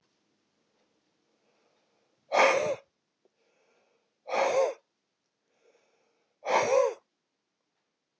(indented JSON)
{
  "exhalation_length": "8.2 s",
  "exhalation_amplitude": 11032,
  "exhalation_signal_mean_std_ratio": 0.33,
  "survey_phase": "beta (2021-08-13 to 2022-03-07)",
  "age": "65+",
  "gender": "Male",
  "wearing_mask": "No",
  "symptom_none": true,
  "smoker_status": "Ex-smoker",
  "respiratory_condition_asthma": false,
  "respiratory_condition_other": false,
  "recruitment_source": "REACT",
  "submission_delay": "1 day",
  "covid_test_result": "Negative",
  "covid_test_method": "RT-qPCR",
  "influenza_a_test_result": "Negative",
  "influenza_b_test_result": "Negative"
}